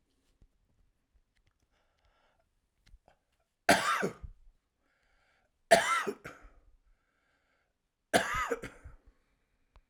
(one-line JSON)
{"cough_length": "9.9 s", "cough_amplitude": 12075, "cough_signal_mean_std_ratio": 0.26, "survey_phase": "alpha (2021-03-01 to 2021-08-12)", "age": "45-64", "gender": "Male", "wearing_mask": "No", "symptom_cough_any": true, "symptom_shortness_of_breath": true, "symptom_fatigue": true, "smoker_status": "Ex-smoker", "respiratory_condition_asthma": false, "respiratory_condition_other": true, "recruitment_source": "REACT", "submission_delay": "2 days", "covid_test_result": "Negative", "covid_test_method": "RT-qPCR"}